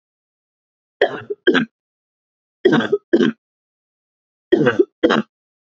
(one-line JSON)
{"three_cough_length": "5.6 s", "three_cough_amplitude": 32329, "three_cough_signal_mean_std_ratio": 0.36, "survey_phase": "beta (2021-08-13 to 2022-03-07)", "age": "18-44", "gender": "Female", "wearing_mask": "No", "symptom_cough_any": true, "symptom_runny_or_blocked_nose": true, "symptom_fatigue": true, "smoker_status": "Never smoked", "respiratory_condition_asthma": false, "respiratory_condition_other": false, "recruitment_source": "Test and Trace", "submission_delay": "0 days", "covid_test_result": "Negative", "covid_test_method": "RT-qPCR"}